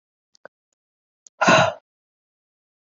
{
  "exhalation_length": "2.9 s",
  "exhalation_amplitude": 24517,
  "exhalation_signal_mean_std_ratio": 0.25,
  "survey_phase": "beta (2021-08-13 to 2022-03-07)",
  "age": "18-44",
  "gender": "Female",
  "wearing_mask": "No",
  "symptom_cough_any": true,
  "symptom_runny_or_blocked_nose": true,
  "symptom_sore_throat": true,
  "symptom_diarrhoea": true,
  "symptom_fatigue": true,
  "symptom_fever_high_temperature": true,
  "symptom_headache": true,
  "symptom_change_to_sense_of_smell_or_taste": true,
  "symptom_loss_of_taste": true,
  "symptom_onset": "4 days",
  "smoker_status": "Ex-smoker",
  "respiratory_condition_asthma": true,
  "respiratory_condition_other": false,
  "recruitment_source": "Test and Trace",
  "submission_delay": "1 day",
  "covid_test_result": "Positive",
  "covid_test_method": "RT-qPCR",
  "covid_ct_value": 15.4,
  "covid_ct_gene": "ORF1ab gene"
}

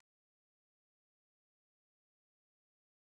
{
  "cough_length": "3.2 s",
  "cough_amplitude": 38,
  "cough_signal_mean_std_ratio": 0.02,
  "survey_phase": "beta (2021-08-13 to 2022-03-07)",
  "age": "45-64",
  "gender": "Female",
  "wearing_mask": "No",
  "symptom_none": true,
  "smoker_status": "Current smoker (11 or more cigarettes per day)",
  "respiratory_condition_asthma": false,
  "respiratory_condition_other": false,
  "recruitment_source": "REACT",
  "submission_delay": "2 days",
  "covid_test_result": "Negative",
  "covid_test_method": "RT-qPCR"
}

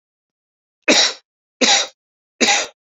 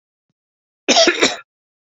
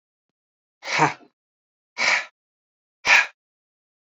{
  "three_cough_length": "3.0 s",
  "three_cough_amplitude": 32768,
  "three_cough_signal_mean_std_ratio": 0.4,
  "cough_length": "1.9 s",
  "cough_amplitude": 32768,
  "cough_signal_mean_std_ratio": 0.37,
  "exhalation_length": "4.1 s",
  "exhalation_amplitude": 23502,
  "exhalation_signal_mean_std_ratio": 0.3,
  "survey_phase": "beta (2021-08-13 to 2022-03-07)",
  "age": "18-44",
  "gender": "Male",
  "wearing_mask": "No",
  "symptom_sore_throat": true,
  "symptom_onset": "4 days",
  "smoker_status": "Ex-smoker",
  "respiratory_condition_asthma": false,
  "respiratory_condition_other": false,
  "recruitment_source": "REACT",
  "submission_delay": "1 day",
  "covid_test_result": "Negative",
  "covid_test_method": "RT-qPCR"
}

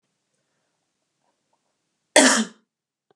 {
  "cough_length": "3.2 s",
  "cough_amplitude": 32176,
  "cough_signal_mean_std_ratio": 0.23,
  "survey_phase": "beta (2021-08-13 to 2022-03-07)",
  "age": "45-64",
  "gender": "Female",
  "wearing_mask": "No",
  "symptom_none": true,
  "smoker_status": "Ex-smoker",
  "respiratory_condition_asthma": false,
  "respiratory_condition_other": false,
  "recruitment_source": "REACT",
  "submission_delay": "2 days",
  "covid_test_result": "Negative",
  "covid_test_method": "RT-qPCR",
  "influenza_a_test_result": "Unknown/Void",
  "influenza_b_test_result": "Unknown/Void"
}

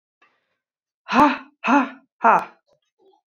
{
  "exhalation_length": "3.3 s",
  "exhalation_amplitude": 27768,
  "exhalation_signal_mean_std_ratio": 0.34,
  "survey_phase": "beta (2021-08-13 to 2022-03-07)",
  "age": "18-44",
  "gender": "Female",
  "wearing_mask": "No",
  "symptom_cough_any": true,
  "symptom_runny_or_blocked_nose": true,
  "symptom_sore_throat": true,
  "symptom_fatigue": true,
  "symptom_fever_high_temperature": true,
  "symptom_onset": "3 days",
  "smoker_status": "Ex-smoker",
  "respiratory_condition_asthma": false,
  "respiratory_condition_other": false,
  "recruitment_source": "REACT",
  "submission_delay": "1 day",
  "covid_test_result": "Negative",
  "covid_test_method": "RT-qPCR",
  "influenza_a_test_result": "Unknown/Void",
  "influenza_b_test_result": "Unknown/Void"
}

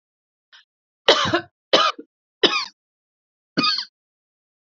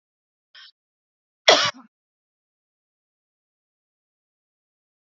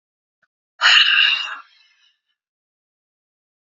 {
  "three_cough_length": "4.6 s",
  "three_cough_amplitude": 32767,
  "three_cough_signal_mean_std_ratio": 0.34,
  "cough_length": "5.0 s",
  "cough_amplitude": 28766,
  "cough_signal_mean_std_ratio": 0.15,
  "exhalation_length": "3.7 s",
  "exhalation_amplitude": 30106,
  "exhalation_signal_mean_std_ratio": 0.34,
  "survey_phase": "beta (2021-08-13 to 2022-03-07)",
  "age": "45-64",
  "gender": "Female",
  "wearing_mask": "No",
  "symptom_cough_any": true,
  "symptom_shortness_of_breath": true,
  "symptom_sore_throat": true,
  "symptom_abdominal_pain": true,
  "symptom_diarrhoea": true,
  "symptom_fatigue": true,
  "symptom_fever_high_temperature": true,
  "symptom_headache": true,
  "symptom_loss_of_taste": true,
  "symptom_onset": "13 days",
  "smoker_status": "Ex-smoker",
  "respiratory_condition_asthma": false,
  "respiratory_condition_other": false,
  "recruitment_source": "Test and Trace",
  "submission_delay": "8 days",
  "covid_test_result": "Negative",
  "covid_test_method": "ePCR"
}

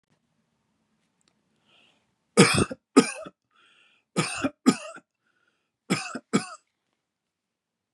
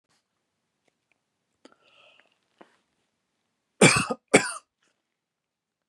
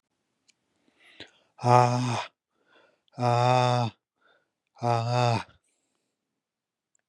{
  "three_cough_length": "7.9 s",
  "three_cough_amplitude": 27176,
  "three_cough_signal_mean_std_ratio": 0.25,
  "cough_length": "5.9 s",
  "cough_amplitude": 25335,
  "cough_signal_mean_std_ratio": 0.19,
  "exhalation_length": "7.1 s",
  "exhalation_amplitude": 21459,
  "exhalation_signal_mean_std_ratio": 0.39,
  "survey_phase": "beta (2021-08-13 to 2022-03-07)",
  "age": "18-44",
  "gender": "Male",
  "wearing_mask": "No",
  "symptom_cough_any": true,
  "smoker_status": "Never smoked",
  "respiratory_condition_asthma": false,
  "respiratory_condition_other": false,
  "recruitment_source": "REACT",
  "submission_delay": "1 day",
  "covid_test_result": "Negative",
  "covid_test_method": "RT-qPCR"
}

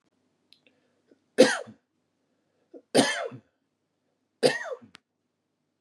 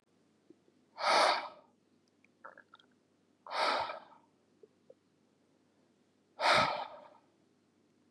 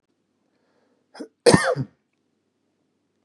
{
  "three_cough_length": "5.8 s",
  "three_cough_amplitude": 22182,
  "three_cough_signal_mean_std_ratio": 0.24,
  "exhalation_length": "8.1 s",
  "exhalation_amplitude": 5662,
  "exhalation_signal_mean_std_ratio": 0.33,
  "cough_length": "3.2 s",
  "cough_amplitude": 30964,
  "cough_signal_mean_std_ratio": 0.23,
  "survey_phase": "beta (2021-08-13 to 2022-03-07)",
  "age": "45-64",
  "gender": "Male",
  "wearing_mask": "No",
  "symptom_none": true,
  "smoker_status": "Ex-smoker",
  "respiratory_condition_asthma": false,
  "respiratory_condition_other": false,
  "recruitment_source": "REACT",
  "submission_delay": "6 days",
  "covid_test_result": "Negative",
  "covid_test_method": "RT-qPCR",
  "influenza_a_test_result": "Negative",
  "influenza_b_test_result": "Negative"
}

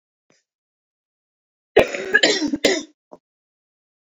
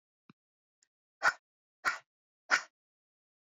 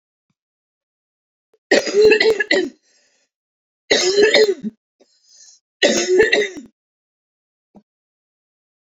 {
  "cough_length": "4.0 s",
  "cough_amplitude": 27787,
  "cough_signal_mean_std_ratio": 0.32,
  "exhalation_length": "3.4 s",
  "exhalation_amplitude": 7280,
  "exhalation_signal_mean_std_ratio": 0.21,
  "three_cough_length": "9.0 s",
  "three_cough_amplitude": 32767,
  "three_cough_signal_mean_std_ratio": 0.4,
  "survey_phase": "beta (2021-08-13 to 2022-03-07)",
  "age": "18-44",
  "gender": "Female",
  "wearing_mask": "No",
  "symptom_cough_any": true,
  "symptom_runny_or_blocked_nose": true,
  "symptom_fatigue": true,
  "symptom_onset": "10 days",
  "smoker_status": "Never smoked",
  "respiratory_condition_asthma": false,
  "respiratory_condition_other": false,
  "recruitment_source": "REACT",
  "submission_delay": "3 days",
  "covid_test_result": "Negative",
  "covid_test_method": "RT-qPCR",
  "influenza_a_test_result": "Negative",
  "influenza_b_test_result": "Negative"
}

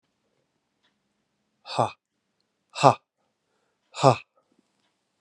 {
  "exhalation_length": "5.2 s",
  "exhalation_amplitude": 29916,
  "exhalation_signal_mean_std_ratio": 0.18,
  "survey_phase": "beta (2021-08-13 to 2022-03-07)",
  "age": "45-64",
  "gender": "Male",
  "wearing_mask": "No",
  "symptom_new_continuous_cough": true,
  "symptom_runny_or_blocked_nose": true,
  "symptom_shortness_of_breath": true,
  "symptom_sore_throat": true,
  "symptom_fatigue": true,
  "symptom_headache": true,
  "symptom_change_to_sense_of_smell_or_taste": true,
  "symptom_onset": "3 days",
  "smoker_status": "Never smoked",
  "respiratory_condition_asthma": false,
  "respiratory_condition_other": false,
  "recruitment_source": "Test and Trace",
  "submission_delay": "1 day",
  "covid_test_result": "Positive",
  "covid_test_method": "ePCR"
}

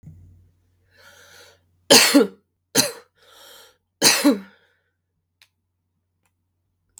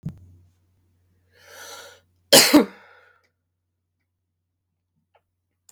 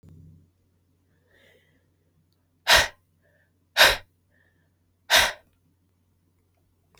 {
  "three_cough_length": "7.0 s",
  "three_cough_amplitude": 32768,
  "three_cough_signal_mean_std_ratio": 0.27,
  "cough_length": "5.7 s",
  "cough_amplitude": 32768,
  "cough_signal_mean_std_ratio": 0.2,
  "exhalation_length": "7.0 s",
  "exhalation_amplitude": 27483,
  "exhalation_signal_mean_std_ratio": 0.23,
  "survey_phase": "beta (2021-08-13 to 2022-03-07)",
  "age": "18-44",
  "gender": "Female",
  "wearing_mask": "No",
  "symptom_cough_any": true,
  "symptom_runny_or_blocked_nose": true,
  "symptom_sore_throat": true,
  "symptom_abdominal_pain": true,
  "symptom_fatigue": true,
  "symptom_headache": true,
  "symptom_other": true,
  "symptom_onset": "4 days",
  "smoker_status": "Never smoked",
  "respiratory_condition_asthma": false,
  "respiratory_condition_other": false,
  "recruitment_source": "Test and Trace",
  "submission_delay": "1 day",
  "covid_test_result": "Positive",
  "covid_test_method": "RT-qPCR",
  "covid_ct_value": 14.9,
  "covid_ct_gene": "ORF1ab gene",
  "covid_ct_mean": 15.2,
  "covid_viral_load": "11000000 copies/ml",
  "covid_viral_load_category": "High viral load (>1M copies/ml)"
}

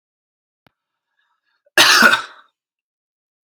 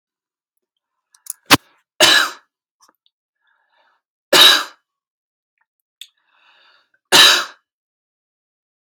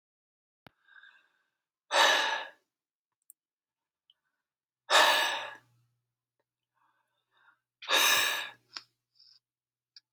{
  "cough_length": "3.4 s",
  "cough_amplitude": 32634,
  "cough_signal_mean_std_ratio": 0.29,
  "three_cough_length": "8.9 s",
  "three_cough_amplitude": 32768,
  "three_cough_signal_mean_std_ratio": 0.26,
  "exhalation_length": "10.1 s",
  "exhalation_amplitude": 10031,
  "exhalation_signal_mean_std_ratio": 0.31,
  "survey_phase": "alpha (2021-03-01 to 2021-08-12)",
  "age": "18-44",
  "gender": "Male",
  "wearing_mask": "No",
  "symptom_none": true,
  "smoker_status": "Ex-smoker",
  "respiratory_condition_asthma": false,
  "respiratory_condition_other": false,
  "recruitment_source": "REACT",
  "submission_delay": "1 day",
  "covid_test_result": "Negative",
  "covid_test_method": "RT-qPCR"
}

